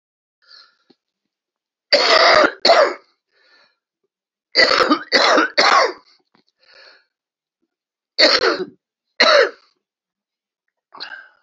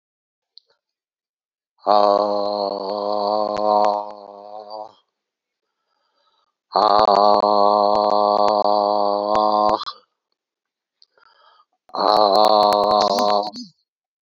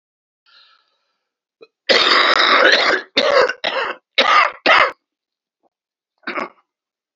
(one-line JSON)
{"three_cough_length": "11.4 s", "three_cough_amplitude": 32768, "three_cough_signal_mean_std_ratio": 0.4, "exhalation_length": "14.2 s", "exhalation_amplitude": 32767, "exhalation_signal_mean_std_ratio": 0.51, "cough_length": "7.2 s", "cough_amplitude": 32768, "cough_signal_mean_std_ratio": 0.47, "survey_phase": "beta (2021-08-13 to 2022-03-07)", "age": "65+", "gender": "Male", "wearing_mask": "No", "symptom_cough_any": true, "symptom_runny_or_blocked_nose": true, "symptom_shortness_of_breath": true, "symptom_fatigue": true, "smoker_status": "Ex-smoker", "respiratory_condition_asthma": false, "respiratory_condition_other": false, "recruitment_source": "Test and Trace", "submission_delay": "2 days", "covid_test_result": "Positive", "covid_test_method": "RT-qPCR", "covid_ct_value": 14.8, "covid_ct_gene": "N gene", "covid_ct_mean": 14.9, "covid_viral_load": "13000000 copies/ml", "covid_viral_load_category": "High viral load (>1M copies/ml)"}